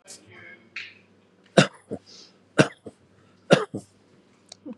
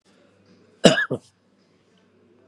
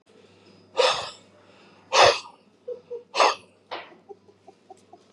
three_cough_length: 4.8 s
three_cough_amplitude: 30676
three_cough_signal_mean_std_ratio: 0.22
cough_length: 2.5 s
cough_amplitude: 32768
cough_signal_mean_std_ratio: 0.22
exhalation_length: 5.1 s
exhalation_amplitude: 22842
exhalation_signal_mean_std_ratio: 0.32
survey_phase: beta (2021-08-13 to 2022-03-07)
age: 65+
gender: Male
wearing_mask: 'No'
symptom_none: true
smoker_status: Ex-smoker
respiratory_condition_asthma: false
respiratory_condition_other: false
recruitment_source: REACT
submission_delay: 3 days
covid_test_result: Negative
covid_test_method: RT-qPCR
influenza_a_test_result: Negative
influenza_b_test_result: Negative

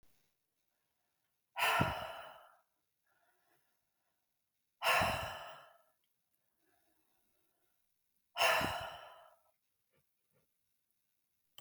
exhalation_length: 11.6 s
exhalation_amplitude: 4083
exhalation_signal_mean_std_ratio: 0.3
survey_phase: beta (2021-08-13 to 2022-03-07)
age: 45-64
gender: Female
wearing_mask: 'No'
symptom_none: true
smoker_status: Never smoked
respiratory_condition_asthma: false
respiratory_condition_other: false
recruitment_source: REACT
submission_delay: 2 days
covid_test_result: Negative
covid_test_method: RT-qPCR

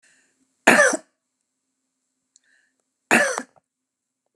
cough_length: 4.4 s
cough_amplitude: 32768
cough_signal_mean_std_ratio: 0.26
survey_phase: alpha (2021-03-01 to 2021-08-12)
age: 65+
gender: Female
wearing_mask: 'No'
symptom_none: true
smoker_status: Ex-smoker
respiratory_condition_asthma: false
respiratory_condition_other: false
recruitment_source: REACT
submission_delay: 3 days
covid_test_result: Negative
covid_test_method: RT-qPCR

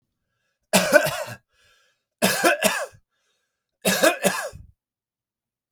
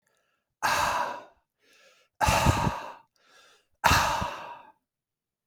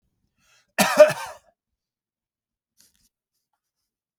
three_cough_length: 5.7 s
three_cough_amplitude: 31140
three_cough_signal_mean_std_ratio: 0.39
exhalation_length: 5.5 s
exhalation_amplitude: 17264
exhalation_signal_mean_std_ratio: 0.45
cough_length: 4.2 s
cough_amplitude: 32768
cough_signal_mean_std_ratio: 0.19
survey_phase: beta (2021-08-13 to 2022-03-07)
age: 45-64
gender: Male
wearing_mask: 'No'
symptom_cough_any: true
symptom_runny_or_blocked_nose: true
symptom_other: true
symptom_onset: 12 days
smoker_status: Ex-smoker
respiratory_condition_asthma: false
respiratory_condition_other: false
recruitment_source: REACT
submission_delay: 1 day
covid_test_result: Negative
covid_test_method: RT-qPCR
influenza_a_test_result: Negative
influenza_b_test_result: Negative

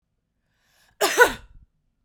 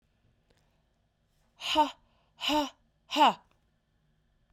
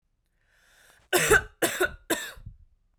cough_length: 2.0 s
cough_amplitude: 28328
cough_signal_mean_std_ratio: 0.27
exhalation_length: 4.5 s
exhalation_amplitude: 8964
exhalation_signal_mean_std_ratio: 0.3
three_cough_length: 3.0 s
three_cough_amplitude: 15013
three_cough_signal_mean_std_ratio: 0.37
survey_phase: beta (2021-08-13 to 2022-03-07)
age: 18-44
gender: Female
wearing_mask: 'No'
symptom_runny_or_blocked_nose: true
symptom_fatigue: true
symptom_headache: true
symptom_onset: 3 days
smoker_status: Never smoked
respiratory_condition_asthma: false
respiratory_condition_other: false
recruitment_source: Test and Trace
submission_delay: 2 days
covid_test_result: Positive
covid_test_method: ePCR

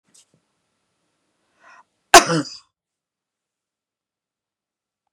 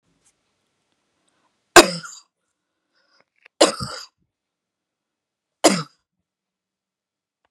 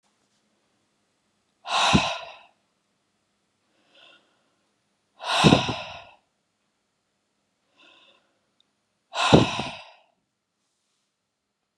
cough_length: 5.1 s
cough_amplitude: 32768
cough_signal_mean_std_ratio: 0.14
three_cough_length: 7.5 s
three_cough_amplitude: 32768
three_cough_signal_mean_std_ratio: 0.17
exhalation_length: 11.8 s
exhalation_amplitude: 30954
exhalation_signal_mean_std_ratio: 0.26
survey_phase: beta (2021-08-13 to 2022-03-07)
age: 45-64
gender: Female
wearing_mask: 'No'
symptom_none: true
smoker_status: Never smoked
respiratory_condition_asthma: false
respiratory_condition_other: false
recruitment_source: REACT
submission_delay: 2 days
covid_test_result: Negative
covid_test_method: RT-qPCR
influenza_a_test_result: Negative
influenza_b_test_result: Negative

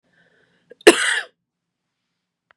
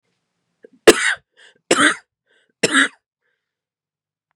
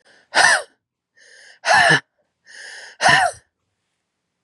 cough_length: 2.6 s
cough_amplitude: 32768
cough_signal_mean_std_ratio: 0.22
three_cough_length: 4.4 s
three_cough_amplitude: 32768
three_cough_signal_mean_std_ratio: 0.28
exhalation_length: 4.4 s
exhalation_amplitude: 31363
exhalation_signal_mean_std_ratio: 0.38
survey_phase: beta (2021-08-13 to 2022-03-07)
age: 18-44
gender: Female
wearing_mask: 'No'
symptom_cough_any: true
symptom_runny_or_blocked_nose: true
symptom_shortness_of_breath: true
symptom_sore_throat: true
smoker_status: Ex-smoker
respiratory_condition_asthma: true
respiratory_condition_other: false
recruitment_source: Test and Trace
submission_delay: 1 day
covid_test_result: Positive
covid_test_method: LFT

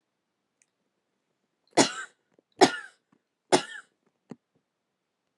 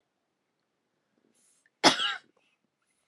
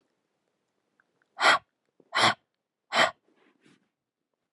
three_cough_length: 5.4 s
three_cough_amplitude: 23980
three_cough_signal_mean_std_ratio: 0.19
cough_length: 3.1 s
cough_amplitude: 18335
cough_signal_mean_std_ratio: 0.2
exhalation_length: 4.5 s
exhalation_amplitude: 14028
exhalation_signal_mean_std_ratio: 0.27
survey_phase: beta (2021-08-13 to 2022-03-07)
age: 18-44
gender: Female
wearing_mask: 'No'
symptom_none: true
smoker_status: Never smoked
respiratory_condition_asthma: false
respiratory_condition_other: false
recruitment_source: REACT
submission_delay: 2 days
covid_test_result: Negative
covid_test_method: RT-qPCR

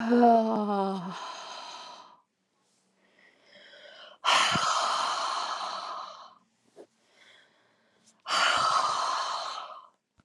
exhalation_length: 10.2 s
exhalation_amplitude: 11487
exhalation_signal_mean_std_ratio: 0.54
survey_phase: alpha (2021-03-01 to 2021-08-12)
age: 45-64
gender: Female
wearing_mask: 'No'
symptom_none: true
smoker_status: Never smoked
respiratory_condition_asthma: false
respiratory_condition_other: false
recruitment_source: REACT
submission_delay: 1 day
covid_test_result: Negative
covid_test_method: RT-qPCR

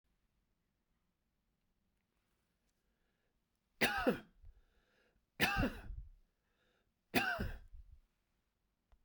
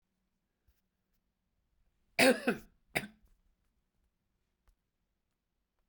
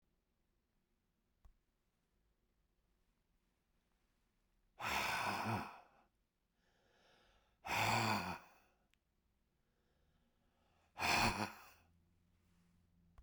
three_cough_length: 9.0 s
three_cough_amplitude: 5276
three_cough_signal_mean_std_ratio: 0.29
cough_length: 5.9 s
cough_amplitude: 8739
cough_signal_mean_std_ratio: 0.18
exhalation_length: 13.2 s
exhalation_amplitude: 2709
exhalation_signal_mean_std_ratio: 0.33
survey_phase: beta (2021-08-13 to 2022-03-07)
age: 65+
gender: Male
wearing_mask: 'No'
symptom_runny_or_blocked_nose: true
smoker_status: Ex-smoker
respiratory_condition_asthma: false
respiratory_condition_other: false
recruitment_source: REACT
submission_delay: 1 day
covid_test_result: Negative
covid_test_method: RT-qPCR
influenza_a_test_result: Negative
influenza_b_test_result: Negative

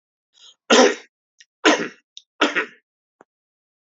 three_cough_length: 3.8 s
three_cough_amplitude: 29481
three_cough_signal_mean_std_ratio: 0.3
survey_phase: alpha (2021-03-01 to 2021-08-12)
age: 45-64
gender: Male
wearing_mask: 'No'
symptom_cough_any: true
symptom_onset: 5 days
smoker_status: Never smoked
respiratory_condition_asthma: false
respiratory_condition_other: false
recruitment_source: Test and Trace
submission_delay: 1 day
covid_test_result: Positive
covid_test_method: RT-qPCR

